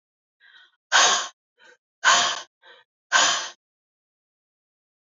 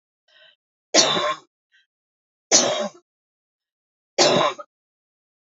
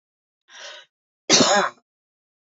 {"exhalation_length": "5.0 s", "exhalation_amplitude": 22145, "exhalation_signal_mean_std_ratio": 0.35, "three_cough_length": "5.5 s", "three_cough_amplitude": 29563, "three_cough_signal_mean_std_ratio": 0.35, "cough_length": "2.5 s", "cough_amplitude": 26037, "cough_signal_mean_std_ratio": 0.33, "survey_phase": "beta (2021-08-13 to 2022-03-07)", "age": "45-64", "gender": "Female", "wearing_mask": "No", "symptom_cough_any": true, "symptom_sore_throat": true, "symptom_fatigue": true, "symptom_headache": true, "symptom_onset": "3 days", "smoker_status": "Ex-smoker", "respiratory_condition_asthma": false, "respiratory_condition_other": false, "recruitment_source": "Test and Trace", "submission_delay": "2 days", "covid_test_result": "Positive", "covid_test_method": "RT-qPCR", "covid_ct_value": 26.5, "covid_ct_gene": "ORF1ab gene", "covid_ct_mean": 26.8, "covid_viral_load": "1700 copies/ml", "covid_viral_load_category": "Minimal viral load (< 10K copies/ml)"}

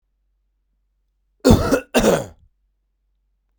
{"cough_length": "3.6 s", "cough_amplitude": 32768, "cough_signal_mean_std_ratio": 0.32, "survey_phase": "beta (2021-08-13 to 2022-03-07)", "age": "18-44", "gender": "Male", "wearing_mask": "No", "symptom_cough_any": true, "symptom_runny_or_blocked_nose": true, "symptom_shortness_of_breath": true, "symptom_fatigue": true, "symptom_headache": true, "symptom_onset": "2 days", "smoker_status": "Ex-smoker", "respiratory_condition_asthma": false, "respiratory_condition_other": false, "recruitment_source": "Test and Trace", "submission_delay": "2 days", "covid_test_result": "Positive", "covid_test_method": "RT-qPCR", "covid_ct_value": 23.1, "covid_ct_gene": "N gene"}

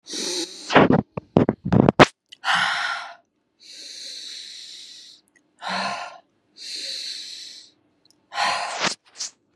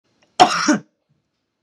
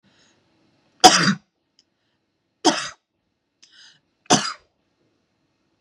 {"exhalation_length": "9.6 s", "exhalation_amplitude": 32768, "exhalation_signal_mean_std_ratio": 0.39, "cough_length": "1.6 s", "cough_amplitude": 32768, "cough_signal_mean_std_ratio": 0.34, "three_cough_length": "5.8 s", "three_cough_amplitude": 32768, "three_cough_signal_mean_std_ratio": 0.23, "survey_phase": "beta (2021-08-13 to 2022-03-07)", "age": "18-44", "gender": "Female", "wearing_mask": "No", "symptom_none": true, "symptom_onset": "12 days", "smoker_status": "Never smoked", "respiratory_condition_asthma": false, "respiratory_condition_other": false, "recruitment_source": "REACT", "submission_delay": "0 days", "covid_test_result": "Negative", "covid_test_method": "RT-qPCR", "influenza_a_test_result": "Negative", "influenza_b_test_result": "Negative"}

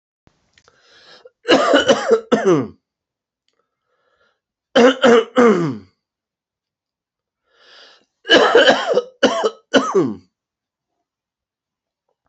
{"three_cough_length": "12.3 s", "three_cough_amplitude": 32396, "three_cough_signal_mean_std_ratio": 0.4, "survey_phase": "beta (2021-08-13 to 2022-03-07)", "age": "45-64", "gender": "Male", "wearing_mask": "No", "symptom_change_to_sense_of_smell_or_taste": true, "symptom_loss_of_taste": true, "smoker_status": "Never smoked", "respiratory_condition_asthma": false, "respiratory_condition_other": false, "recruitment_source": "Test and Trace", "submission_delay": "2 days", "covid_test_result": "Positive", "covid_test_method": "RT-qPCR", "covid_ct_value": 13.0, "covid_ct_gene": "ORF1ab gene", "covid_ct_mean": 13.2, "covid_viral_load": "48000000 copies/ml", "covid_viral_load_category": "High viral load (>1M copies/ml)"}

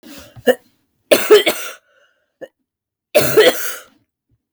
{"cough_length": "4.5 s", "cough_amplitude": 32768, "cough_signal_mean_std_ratio": 0.37, "survey_phase": "beta (2021-08-13 to 2022-03-07)", "age": "18-44", "gender": "Female", "wearing_mask": "No", "symptom_cough_any": true, "symptom_runny_or_blocked_nose": true, "symptom_sore_throat": true, "symptom_abdominal_pain": true, "symptom_fatigue": true, "symptom_headache": true, "symptom_onset": "3 days", "smoker_status": "Never smoked", "respiratory_condition_asthma": false, "respiratory_condition_other": false, "recruitment_source": "REACT", "submission_delay": "1 day", "covid_test_result": "Negative", "covid_test_method": "RT-qPCR", "influenza_a_test_result": "Unknown/Void", "influenza_b_test_result": "Unknown/Void"}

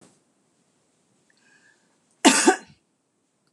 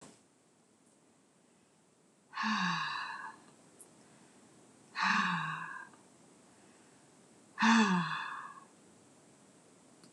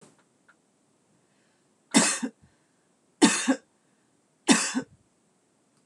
{"cough_length": "3.5 s", "cough_amplitude": 24999, "cough_signal_mean_std_ratio": 0.22, "exhalation_length": "10.1 s", "exhalation_amplitude": 6512, "exhalation_signal_mean_std_ratio": 0.4, "three_cough_length": "5.9 s", "three_cough_amplitude": 20062, "three_cough_signal_mean_std_ratio": 0.29, "survey_phase": "beta (2021-08-13 to 2022-03-07)", "age": "45-64", "gender": "Female", "wearing_mask": "No", "symptom_none": true, "smoker_status": "Never smoked", "respiratory_condition_asthma": false, "respiratory_condition_other": false, "recruitment_source": "REACT", "submission_delay": "1 day", "covid_test_result": "Negative", "covid_test_method": "RT-qPCR", "influenza_a_test_result": "Negative", "influenza_b_test_result": "Negative"}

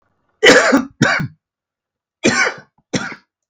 {"cough_length": "3.5 s", "cough_amplitude": 32768, "cough_signal_mean_std_ratio": 0.43, "survey_phase": "beta (2021-08-13 to 2022-03-07)", "age": "45-64", "gender": "Male", "wearing_mask": "No", "symptom_cough_any": true, "symptom_runny_or_blocked_nose": true, "symptom_sore_throat": true, "symptom_fatigue": true, "symptom_headache": true, "symptom_change_to_sense_of_smell_or_taste": true, "smoker_status": "Current smoker (11 or more cigarettes per day)", "respiratory_condition_asthma": false, "respiratory_condition_other": false, "recruitment_source": "Test and Trace", "submission_delay": "1 day", "covid_test_result": "Negative", "covid_test_method": "RT-qPCR"}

